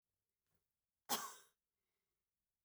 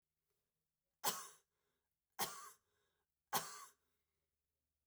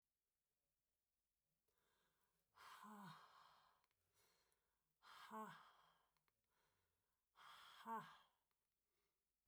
{"cough_length": "2.6 s", "cough_amplitude": 2125, "cough_signal_mean_std_ratio": 0.21, "three_cough_length": "4.9 s", "three_cough_amplitude": 2363, "three_cough_signal_mean_std_ratio": 0.26, "exhalation_length": "9.5 s", "exhalation_amplitude": 251, "exhalation_signal_mean_std_ratio": 0.37, "survey_phase": "beta (2021-08-13 to 2022-03-07)", "age": "45-64", "gender": "Female", "wearing_mask": "No", "symptom_other": true, "symptom_onset": "13 days", "smoker_status": "Never smoked", "respiratory_condition_asthma": false, "respiratory_condition_other": false, "recruitment_source": "REACT", "submission_delay": "1 day", "covid_test_result": "Negative", "covid_test_method": "RT-qPCR", "influenza_a_test_result": "Negative", "influenza_b_test_result": "Negative"}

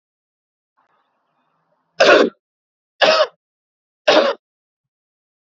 {"three_cough_length": "5.5 s", "three_cough_amplitude": 28837, "three_cough_signal_mean_std_ratio": 0.3, "survey_phase": "beta (2021-08-13 to 2022-03-07)", "age": "18-44", "gender": "Male", "wearing_mask": "No", "symptom_fatigue": true, "symptom_other": true, "smoker_status": "Never smoked", "respiratory_condition_asthma": false, "respiratory_condition_other": false, "recruitment_source": "REACT", "submission_delay": "1 day", "covid_test_result": "Negative", "covid_test_method": "RT-qPCR", "influenza_a_test_result": "Negative", "influenza_b_test_result": "Negative"}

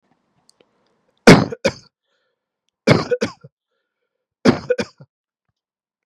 {"three_cough_length": "6.1 s", "three_cough_amplitude": 32768, "three_cough_signal_mean_std_ratio": 0.24, "survey_phase": "beta (2021-08-13 to 2022-03-07)", "age": "18-44", "gender": "Male", "wearing_mask": "No", "symptom_none": true, "smoker_status": "Never smoked", "respiratory_condition_asthma": false, "respiratory_condition_other": false, "recruitment_source": "Test and Trace", "submission_delay": "1 day", "covid_test_result": "Positive", "covid_test_method": "RT-qPCR", "covid_ct_value": 35.4, "covid_ct_gene": "N gene"}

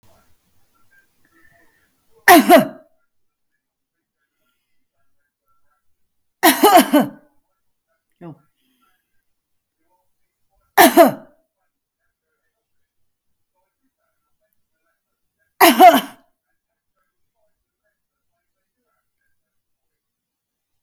{"cough_length": "20.8 s", "cough_amplitude": 32768, "cough_signal_mean_std_ratio": 0.22, "survey_phase": "beta (2021-08-13 to 2022-03-07)", "age": "45-64", "gender": "Female", "wearing_mask": "No", "symptom_none": true, "smoker_status": "Current smoker (e-cigarettes or vapes only)", "respiratory_condition_asthma": false, "respiratory_condition_other": false, "recruitment_source": "REACT", "submission_delay": "2 days", "covid_test_result": "Negative", "covid_test_method": "RT-qPCR"}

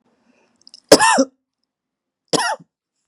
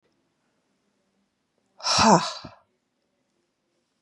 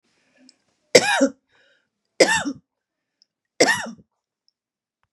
{"cough_length": "3.1 s", "cough_amplitude": 32768, "cough_signal_mean_std_ratio": 0.29, "exhalation_length": "4.0 s", "exhalation_amplitude": 23415, "exhalation_signal_mean_std_ratio": 0.25, "three_cough_length": "5.1 s", "three_cough_amplitude": 32768, "three_cough_signal_mean_std_ratio": 0.28, "survey_phase": "beta (2021-08-13 to 2022-03-07)", "age": "45-64", "gender": "Female", "wearing_mask": "No", "symptom_none": true, "symptom_onset": "12 days", "smoker_status": "Ex-smoker", "respiratory_condition_asthma": false, "respiratory_condition_other": false, "recruitment_source": "REACT", "submission_delay": "2 days", "covid_test_result": "Negative", "covid_test_method": "RT-qPCR", "influenza_a_test_result": "Negative", "influenza_b_test_result": "Negative"}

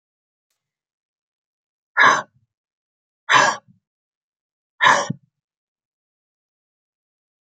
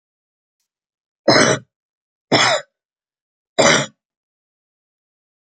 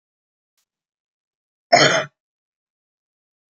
{"exhalation_length": "7.4 s", "exhalation_amplitude": 29131, "exhalation_signal_mean_std_ratio": 0.24, "three_cough_length": "5.5 s", "three_cough_amplitude": 32767, "three_cough_signal_mean_std_ratio": 0.31, "cough_length": "3.6 s", "cough_amplitude": 29776, "cough_signal_mean_std_ratio": 0.22, "survey_phase": "beta (2021-08-13 to 2022-03-07)", "age": "45-64", "gender": "Female", "wearing_mask": "No", "symptom_cough_any": true, "symptom_runny_or_blocked_nose": true, "symptom_onset": "12 days", "smoker_status": "Ex-smoker", "respiratory_condition_asthma": false, "respiratory_condition_other": false, "recruitment_source": "REACT", "submission_delay": "9 days", "covid_test_result": "Negative", "covid_test_method": "RT-qPCR", "influenza_a_test_result": "Negative", "influenza_b_test_result": "Negative"}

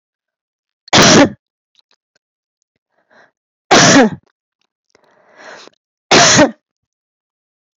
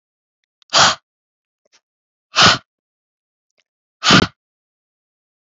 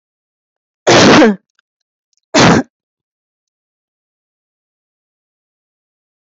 {"three_cough_length": "7.8 s", "three_cough_amplitude": 32768, "three_cough_signal_mean_std_ratio": 0.35, "exhalation_length": "5.5 s", "exhalation_amplitude": 32473, "exhalation_signal_mean_std_ratio": 0.26, "cough_length": "6.3 s", "cough_amplitude": 32768, "cough_signal_mean_std_ratio": 0.31, "survey_phase": "beta (2021-08-13 to 2022-03-07)", "age": "45-64", "gender": "Female", "wearing_mask": "No", "symptom_cough_any": true, "symptom_runny_or_blocked_nose": true, "symptom_headache": true, "symptom_change_to_sense_of_smell_or_taste": true, "symptom_other": true, "symptom_onset": "6 days", "smoker_status": "Ex-smoker", "respiratory_condition_asthma": false, "respiratory_condition_other": false, "recruitment_source": "REACT", "submission_delay": "4 days", "covid_test_result": "Positive", "covid_test_method": "RT-qPCR", "covid_ct_value": 19.0, "covid_ct_gene": "E gene", "influenza_a_test_result": "Negative", "influenza_b_test_result": "Negative"}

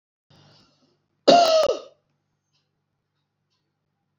{"cough_length": "4.2 s", "cough_amplitude": 27385, "cough_signal_mean_std_ratio": 0.28, "survey_phase": "beta (2021-08-13 to 2022-03-07)", "age": "65+", "gender": "Female", "wearing_mask": "No", "symptom_none": true, "smoker_status": "Never smoked", "respiratory_condition_asthma": false, "respiratory_condition_other": false, "recruitment_source": "REACT", "submission_delay": "2 days", "covid_test_result": "Negative", "covid_test_method": "RT-qPCR", "influenza_a_test_result": "Negative", "influenza_b_test_result": "Negative"}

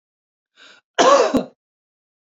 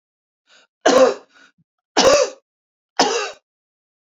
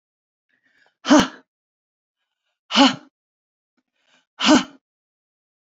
{"cough_length": "2.2 s", "cough_amplitude": 28090, "cough_signal_mean_std_ratio": 0.35, "three_cough_length": "4.0 s", "three_cough_amplitude": 32767, "three_cough_signal_mean_std_ratio": 0.38, "exhalation_length": "5.7 s", "exhalation_amplitude": 28189, "exhalation_signal_mean_std_ratio": 0.26, "survey_phase": "beta (2021-08-13 to 2022-03-07)", "age": "45-64", "gender": "Female", "wearing_mask": "No", "symptom_none": true, "smoker_status": "Never smoked", "respiratory_condition_asthma": false, "respiratory_condition_other": false, "recruitment_source": "REACT", "submission_delay": "5 days", "covid_test_result": "Negative", "covid_test_method": "RT-qPCR"}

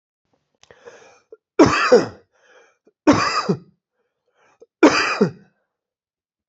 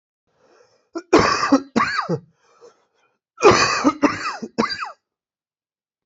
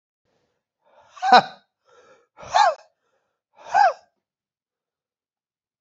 {"three_cough_length": "6.5 s", "three_cough_amplitude": 28654, "three_cough_signal_mean_std_ratio": 0.33, "cough_length": "6.1 s", "cough_amplitude": 28107, "cough_signal_mean_std_ratio": 0.41, "exhalation_length": "5.8 s", "exhalation_amplitude": 27907, "exhalation_signal_mean_std_ratio": 0.25, "survey_phase": "beta (2021-08-13 to 2022-03-07)", "age": "18-44", "gender": "Male", "wearing_mask": "No", "symptom_cough_any": true, "symptom_new_continuous_cough": true, "symptom_runny_or_blocked_nose": true, "symptom_shortness_of_breath": true, "symptom_sore_throat": true, "symptom_fatigue": true, "symptom_fever_high_temperature": true, "symptom_change_to_sense_of_smell_or_taste": true, "symptom_other": true, "smoker_status": "Never smoked", "respiratory_condition_asthma": true, "respiratory_condition_other": false, "recruitment_source": "Test and Trace", "submission_delay": "0 days", "covid_test_result": "Positive", "covid_test_method": "LFT"}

